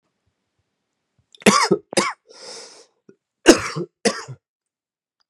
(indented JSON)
{
  "cough_length": "5.3 s",
  "cough_amplitude": 32768,
  "cough_signal_mean_std_ratio": 0.28,
  "survey_phase": "beta (2021-08-13 to 2022-03-07)",
  "age": "18-44",
  "gender": "Male",
  "wearing_mask": "No",
  "symptom_cough_any": true,
  "symptom_runny_or_blocked_nose": true,
  "symptom_sore_throat": true,
  "symptom_abdominal_pain": true,
  "symptom_fatigue": true,
  "symptom_fever_high_temperature": true,
  "symptom_headache": true,
  "symptom_loss_of_taste": true,
  "symptom_onset": "3 days",
  "smoker_status": "Never smoked",
  "respiratory_condition_asthma": false,
  "respiratory_condition_other": false,
  "recruitment_source": "Test and Trace",
  "submission_delay": "1 day",
  "covid_test_result": "Positive",
  "covid_test_method": "RT-qPCR",
  "covid_ct_value": 15.8,
  "covid_ct_gene": "ORF1ab gene",
  "covid_ct_mean": 16.1,
  "covid_viral_load": "5400000 copies/ml",
  "covid_viral_load_category": "High viral load (>1M copies/ml)"
}